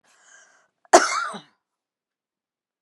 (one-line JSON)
{"cough_length": "2.8 s", "cough_amplitude": 32768, "cough_signal_mean_std_ratio": 0.22, "survey_phase": "beta (2021-08-13 to 2022-03-07)", "age": "65+", "gender": "Female", "wearing_mask": "No", "symptom_none": true, "smoker_status": "Never smoked", "respiratory_condition_asthma": true, "respiratory_condition_other": false, "recruitment_source": "REACT", "submission_delay": "2 days", "covid_test_result": "Negative", "covid_test_method": "RT-qPCR"}